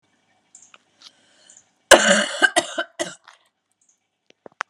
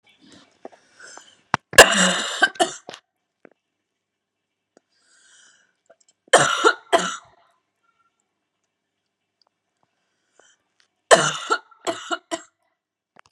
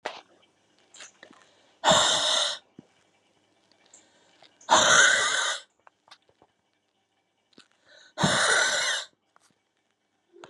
{"cough_length": "4.7 s", "cough_amplitude": 32768, "cough_signal_mean_std_ratio": 0.26, "three_cough_length": "13.3 s", "three_cough_amplitude": 32768, "three_cough_signal_mean_std_ratio": 0.24, "exhalation_length": "10.5 s", "exhalation_amplitude": 17465, "exhalation_signal_mean_std_ratio": 0.39, "survey_phase": "beta (2021-08-13 to 2022-03-07)", "age": "18-44", "gender": "Female", "wearing_mask": "No", "symptom_cough_any": true, "symptom_new_continuous_cough": true, "symptom_runny_or_blocked_nose": true, "symptom_shortness_of_breath": true, "symptom_sore_throat": true, "symptom_abdominal_pain": true, "symptom_diarrhoea": true, "symptom_fatigue": true, "symptom_fever_high_temperature": true, "symptom_headache": true, "symptom_change_to_sense_of_smell_or_taste": true, "symptom_loss_of_taste": true, "symptom_other": true, "symptom_onset": "3 days", "smoker_status": "Never smoked", "recruitment_source": "Test and Trace", "submission_delay": "2 days", "covid_test_result": "Positive", "covid_test_method": "RT-qPCR", "covid_ct_value": 29.2, "covid_ct_gene": "ORF1ab gene", "covid_ct_mean": 30.2, "covid_viral_load": "130 copies/ml", "covid_viral_load_category": "Minimal viral load (< 10K copies/ml)"}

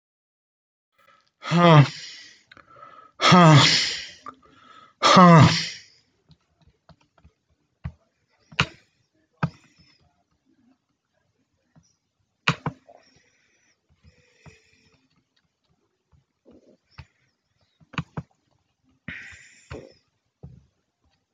{"exhalation_length": "21.3 s", "exhalation_amplitude": 25453, "exhalation_signal_mean_std_ratio": 0.25, "survey_phase": "alpha (2021-03-01 to 2021-08-12)", "age": "65+", "gender": "Male", "wearing_mask": "No", "symptom_none": true, "smoker_status": "Never smoked", "respiratory_condition_asthma": false, "respiratory_condition_other": false, "recruitment_source": "REACT", "submission_delay": "1 day", "covid_test_result": "Negative", "covid_test_method": "RT-qPCR"}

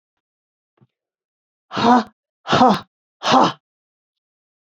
{"exhalation_length": "4.6 s", "exhalation_amplitude": 27551, "exhalation_signal_mean_std_ratio": 0.33, "survey_phase": "beta (2021-08-13 to 2022-03-07)", "age": "45-64", "gender": "Female", "wearing_mask": "No", "symptom_cough_any": true, "symptom_runny_or_blocked_nose": true, "symptom_sore_throat": true, "symptom_fatigue": true, "symptom_headache": true, "symptom_onset": "4 days", "smoker_status": "Ex-smoker", "respiratory_condition_asthma": false, "respiratory_condition_other": false, "recruitment_source": "Test and Trace", "submission_delay": "2 days", "covid_test_result": "Positive", "covid_test_method": "RT-qPCR", "covid_ct_value": 17.8, "covid_ct_gene": "ORF1ab gene"}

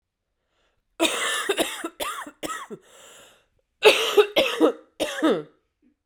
{"cough_length": "6.1 s", "cough_amplitude": 28962, "cough_signal_mean_std_ratio": 0.44, "survey_phase": "beta (2021-08-13 to 2022-03-07)", "age": "18-44", "gender": "Female", "wearing_mask": "No", "symptom_cough_any": true, "symptom_new_continuous_cough": true, "symptom_runny_or_blocked_nose": true, "symptom_shortness_of_breath": true, "symptom_sore_throat": true, "symptom_fatigue": true, "symptom_fever_high_temperature": true, "symptom_headache": true, "symptom_change_to_sense_of_smell_or_taste": true, "symptom_onset": "2 days", "smoker_status": "Current smoker (e-cigarettes or vapes only)", "respiratory_condition_asthma": true, "respiratory_condition_other": false, "recruitment_source": "Test and Trace", "submission_delay": "2 days", "covid_test_result": "Positive", "covid_test_method": "RT-qPCR", "covid_ct_value": 17.2, "covid_ct_gene": "ORF1ab gene", "covid_ct_mean": 17.8, "covid_viral_load": "1400000 copies/ml", "covid_viral_load_category": "High viral load (>1M copies/ml)"}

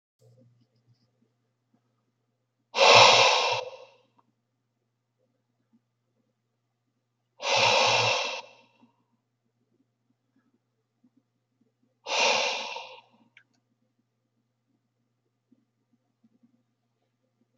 {"exhalation_length": "17.6 s", "exhalation_amplitude": 26265, "exhalation_signal_mean_std_ratio": 0.27, "survey_phase": "beta (2021-08-13 to 2022-03-07)", "age": "65+", "gender": "Male", "wearing_mask": "No", "symptom_none": true, "smoker_status": "Never smoked", "respiratory_condition_asthma": false, "respiratory_condition_other": false, "recruitment_source": "REACT", "submission_delay": "4 days", "covid_test_result": "Negative", "covid_test_method": "RT-qPCR", "influenza_a_test_result": "Negative", "influenza_b_test_result": "Negative"}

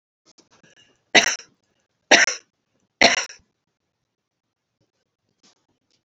{"three_cough_length": "6.1 s", "three_cough_amplitude": 32688, "three_cough_signal_mean_std_ratio": 0.22, "survey_phase": "beta (2021-08-13 to 2022-03-07)", "age": "65+", "gender": "Female", "wearing_mask": "No", "symptom_none": true, "smoker_status": "Ex-smoker", "respiratory_condition_asthma": true, "respiratory_condition_other": true, "recruitment_source": "REACT", "submission_delay": "1 day", "covid_test_result": "Negative", "covid_test_method": "RT-qPCR", "influenza_a_test_result": "Negative", "influenza_b_test_result": "Negative"}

